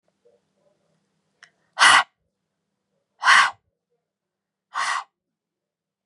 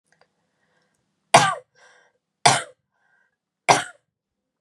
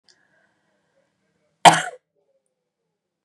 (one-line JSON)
{"exhalation_length": "6.1 s", "exhalation_amplitude": 29929, "exhalation_signal_mean_std_ratio": 0.26, "three_cough_length": "4.6 s", "three_cough_amplitude": 32654, "three_cough_signal_mean_std_ratio": 0.23, "cough_length": "3.2 s", "cough_amplitude": 32768, "cough_signal_mean_std_ratio": 0.16, "survey_phase": "beta (2021-08-13 to 2022-03-07)", "age": "18-44", "gender": "Female", "wearing_mask": "No", "symptom_runny_or_blocked_nose": true, "symptom_onset": "4 days", "smoker_status": "Never smoked", "respiratory_condition_asthma": false, "respiratory_condition_other": false, "recruitment_source": "Test and Trace", "submission_delay": "1 day", "covid_test_result": "Positive", "covid_test_method": "RT-qPCR", "covid_ct_value": 21.8, "covid_ct_gene": "ORF1ab gene", "covid_ct_mean": 22.1, "covid_viral_load": "56000 copies/ml", "covid_viral_load_category": "Low viral load (10K-1M copies/ml)"}